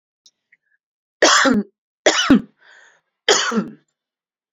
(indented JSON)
{
  "three_cough_length": "4.5 s",
  "three_cough_amplitude": 29103,
  "three_cough_signal_mean_std_ratio": 0.39,
  "survey_phase": "alpha (2021-03-01 to 2021-08-12)",
  "age": "45-64",
  "gender": "Female",
  "wearing_mask": "No",
  "symptom_none": true,
  "smoker_status": "Ex-smoker",
  "respiratory_condition_asthma": false,
  "respiratory_condition_other": false,
  "recruitment_source": "REACT",
  "submission_delay": "2 days",
  "covid_test_result": "Negative",
  "covid_test_method": "RT-qPCR"
}